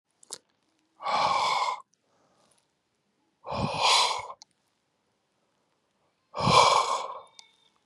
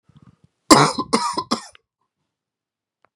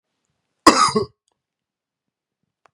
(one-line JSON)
{"exhalation_length": "7.9 s", "exhalation_amplitude": 17621, "exhalation_signal_mean_std_ratio": 0.41, "three_cough_length": "3.2 s", "three_cough_amplitude": 32768, "three_cough_signal_mean_std_ratio": 0.29, "cough_length": "2.7 s", "cough_amplitude": 32768, "cough_signal_mean_std_ratio": 0.25, "survey_phase": "beta (2021-08-13 to 2022-03-07)", "age": "18-44", "gender": "Male", "wearing_mask": "No", "symptom_cough_any": true, "symptom_sore_throat": true, "symptom_fatigue": true, "symptom_fever_high_temperature": true, "symptom_onset": "4 days", "smoker_status": "Never smoked", "respiratory_condition_asthma": false, "respiratory_condition_other": false, "recruitment_source": "Test and Trace", "submission_delay": "3 days", "covid_test_result": "Positive", "covid_test_method": "RT-qPCR", "covid_ct_value": 15.8, "covid_ct_gene": "ORF1ab gene", "covid_ct_mean": 16.0, "covid_viral_load": "5600000 copies/ml", "covid_viral_load_category": "High viral load (>1M copies/ml)"}